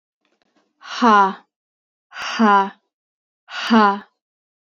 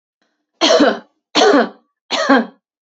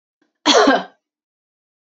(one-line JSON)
{"exhalation_length": "4.6 s", "exhalation_amplitude": 29432, "exhalation_signal_mean_std_ratio": 0.39, "three_cough_length": "3.0 s", "three_cough_amplitude": 31442, "three_cough_signal_mean_std_ratio": 0.49, "cough_length": "1.9 s", "cough_amplitude": 29818, "cough_signal_mean_std_ratio": 0.36, "survey_phase": "beta (2021-08-13 to 2022-03-07)", "age": "18-44", "gender": "Female", "wearing_mask": "No", "symptom_diarrhoea": true, "symptom_onset": "6 days", "smoker_status": "Never smoked", "respiratory_condition_asthma": false, "respiratory_condition_other": false, "recruitment_source": "REACT", "submission_delay": "1 day", "covid_test_result": "Positive", "covid_test_method": "RT-qPCR", "covid_ct_value": 25.0, "covid_ct_gene": "E gene", "influenza_a_test_result": "Negative", "influenza_b_test_result": "Negative"}